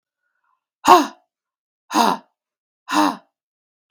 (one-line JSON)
{"exhalation_length": "3.9 s", "exhalation_amplitude": 32767, "exhalation_signal_mean_std_ratio": 0.3, "survey_phase": "beta (2021-08-13 to 2022-03-07)", "age": "45-64", "gender": "Female", "wearing_mask": "No", "symptom_cough_any": true, "symptom_runny_or_blocked_nose": true, "symptom_headache": true, "symptom_change_to_sense_of_smell_or_taste": true, "symptom_loss_of_taste": true, "symptom_onset": "4 days", "smoker_status": "Never smoked", "respiratory_condition_asthma": false, "respiratory_condition_other": false, "recruitment_source": "Test and Trace", "submission_delay": "2 days", "covid_test_result": "Positive", "covid_test_method": "RT-qPCR", "covid_ct_value": 19.6, "covid_ct_gene": "ORF1ab gene", "covid_ct_mean": 19.9, "covid_viral_load": "290000 copies/ml", "covid_viral_load_category": "Low viral load (10K-1M copies/ml)"}